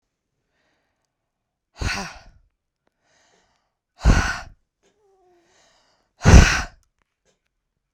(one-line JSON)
{"exhalation_length": "7.9 s", "exhalation_amplitude": 32768, "exhalation_signal_mean_std_ratio": 0.22, "survey_phase": "beta (2021-08-13 to 2022-03-07)", "age": "18-44", "gender": "Female", "wearing_mask": "No", "symptom_none": true, "smoker_status": "Current smoker (11 or more cigarettes per day)", "respiratory_condition_asthma": false, "respiratory_condition_other": false, "recruitment_source": "REACT", "submission_delay": "2 days", "covid_test_result": "Negative", "covid_test_method": "RT-qPCR"}